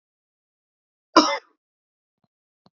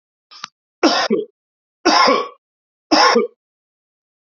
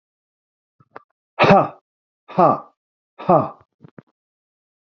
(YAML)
cough_length: 2.7 s
cough_amplitude: 28268
cough_signal_mean_std_ratio: 0.18
three_cough_length: 4.4 s
three_cough_amplitude: 31248
three_cough_signal_mean_std_ratio: 0.42
exhalation_length: 4.9 s
exhalation_amplitude: 27679
exhalation_signal_mean_std_ratio: 0.29
survey_phase: beta (2021-08-13 to 2022-03-07)
age: 65+
gender: Male
wearing_mask: 'No'
symptom_none: true
smoker_status: Ex-smoker
respiratory_condition_asthma: false
respiratory_condition_other: false
recruitment_source: REACT
submission_delay: 0 days
covid_test_result: Negative
covid_test_method: RT-qPCR
influenza_a_test_result: Negative
influenza_b_test_result: Negative